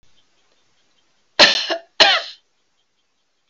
{
  "cough_length": "3.5 s",
  "cough_amplitude": 32767,
  "cough_signal_mean_std_ratio": 0.29,
  "survey_phase": "alpha (2021-03-01 to 2021-08-12)",
  "age": "65+",
  "gender": "Female",
  "wearing_mask": "No",
  "symptom_none": true,
  "smoker_status": "Never smoked",
  "respiratory_condition_asthma": false,
  "respiratory_condition_other": false,
  "recruitment_source": "REACT",
  "submission_delay": "14 days",
  "covid_test_result": "Negative",
  "covid_test_method": "RT-qPCR"
}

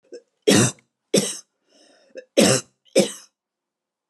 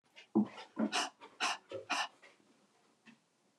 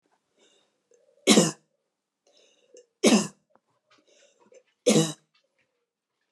{
  "cough_length": "4.1 s",
  "cough_amplitude": 27928,
  "cough_signal_mean_std_ratio": 0.35,
  "exhalation_length": "3.6 s",
  "exhalation_amplitude": 3430,
  "exhalation_signal_mean_std_ratio": 0.4,
  "three_cough_length": "6.3 s",
  "three_cough_amplitude": 23091,
  "three_cough_signal_mean_std_ratio": 0.26,
  "survey_phase": "alpha (2021-03-01 to 2021-08-12)",
  "age": "45-64",
  "gender": "Female",
  "wearing_mask": "No",
  "symptom_none": true,
  "smoker_status": "Never smoked",
  "respiratory_condition_asthma": true,
  "respiratory_condition_other": false,
  "recruitment_source": "Test and Trace",
  "submission_delay": "0 days",
  "covid_test_result": "Negative",
  "covid_test_method": "LFT"
}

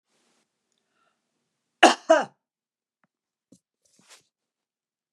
{
  "cough_length": "5.1 s",
  "cough_amplitude": 32011,
  "cough_signal_mean_std_ratio": 0.16,
  "survey_phase": "alpha (2021-03-01 to 2021-08-12)",
  "age": "65+",
  "gender": "Female",
  "wearing_mask": "No",
  "symptom_cough_any": true,
  "smoker_status": "Never smoked",
  "respiratory_condition_asthma": false,
  "respiratory_condition_other": false,
  "recruitment_source": "REACT",
  "submission_delay": "2 days",
  "covid_test_result": "Negative",
  "covid_test_method": "RT-qPCR"
}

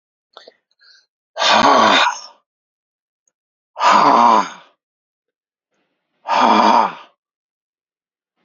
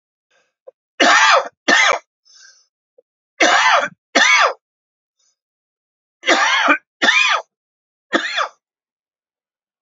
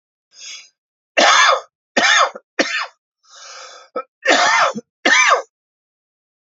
{
  "exhalation_length": "8.4 s",
  "exhalation_amplitude": 32768,
  "exhalation_signal_mean_std_ratio": 0.42,
  "three_cough_length": "9.8 s",
  "three_cough_amplitude": 31631,
  "three_cough_signal_mean_std_ratio": 0.44,
  "cough_length": "6.6 s",
  "cough_amplitude": 30281,
  "cough_signal_mean_std_ratio": 0.46,
  "survey_phase": "alpha (2021-03-01 to 2021-08-12)",
  "age": "45-64",
  "gender": "Male",
  "wearing_mask": "No",
  "symptom_cough_any": true,
  "symptom_new_continuous_cough": true,
  "symptom_abdominal_pain": true,
  "symptom_fatigue": true,
  "symptom_fever_high_temperature": true,
  "symptom_headache": true,
  "smoker_status": "Never smoked",
  "respiratory_condition_asthma": false,
  "respiratory_condition_other": false,
  "recruitment_source": "Test and Trace",
  "submission_delay": "2 days",
  "covid_test_result": "Positive",
  "covid_test_method": "RT-qPCR",
  "covid_ct_value": 14.9,
  "covid_ct_gene": "ORF1ab gene",
  "covid_ct_mean": 15.4,
  "covid_viral_load": "9200000 copies/ml",
  "covid_viral_load_category": "High viral load (>1M copies/ml)"
}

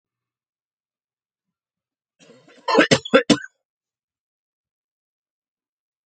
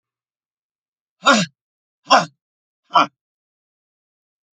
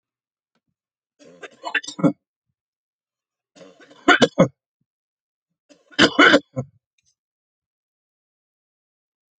{
  "cough_length": "6.1 s",
  "cough_amplitude": 32768,
  "cough_signal_mean_std_ratio": 0.2,
  "exhalation_length": "4.5 s",
  "exhalation_amplitude": 30356,
  "exhalation_signal_mean_std_ratio": 0.24,
  "three_cough_length": "9.4 s",
  "three_cough_amplitude": 32018,
  "three_cough_signal_mean_std_ratio": 0.22,
  "survey_phase": "alpha (2021-03-01 to 2021-08-12)",
  "age": "45-64",
  "gender": "Male",
  "wearing_mask": "No",
  "symptom_none": true,
  "smoker_status": "Never smoked",
  "respiratory_condition_asthma": true,
  "respiratory_condition_other": false,
  "recruitment_source": "Test and Trace",
  "submission_delay": "1 day",
  "covid_test_result": "Negative",
  "covid_test_method": "LFT"
}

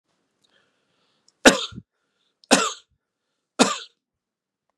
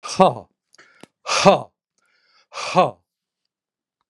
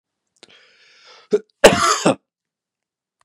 {
  "three_cough_length": "4.8 s",
  "three_cough_amplitude": 32768,
  "three_cough_signal_mean_std_ratio": 0.22,
  "exhalation_length": "4.1 s",
  "exhalation_amplitude": 32767,
  "exhalation_signal_mean_std_ratio": 0.3,
  "cough_length": "3.2 s",
  "cough_amplitude": 32768,
  "cough_signal_mean_std_ratio": 0.28,
  "survey_phase": "beta (2021-08-13 to 2022-03-07)",
  "age": "65+",
  "gender": "Male",
  "wearing_mask": "No",
  "symptom_none": true,
  "smoker_status": "Never smoked",
  "respiratory_condition_asthma": false,
  "respiratory_condition_other": false,
  "recruitment_source": "REACT",
  "submission_delay": "2 days",
  "covid_test_result": "Negative",
  "covid_test_method": "RT-qPCR",
  "influenza_a_test_result": "Negative",
  "influenza_b_test_result": "Negative"
}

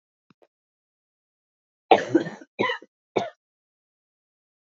{
  "cough_length": "4.6 s",
  "cough_amplitude": 27331,
  "cough_signal_mean_std_ratio": 0.22,
  "survey_phase": "beta (2021-08-13 to 2022-03-07)",
  "age": "18-44",
  "gender": "Female",
  "wearing_mask": "No",
  "symptom_cough_any": true,
  "symptom_new_continuous_cough": true,
  "symptom_runny_or_blocked_nose": true,
  "symptom_shortness_of_breath": true,
  "symptom_fatigue": true,
  "symptom_onset": "12 days",
  "smoker_status": "Never smoked",
  "respiratory_condition_asthma": false,
  "respiratory_condition_other": false,
  "recruitment_source": "REACT",
  "submission_delay": "1 day",
  "covid_test_result": "Positive",
  "covid_test_method": "RT-qPCR",
  "covid_ct_value": 30.3,
  "covid_ct_gene": "E gene",
  "influenza_a_test_result": "Negative",
  "influenza_b_test_result": "Negative"
}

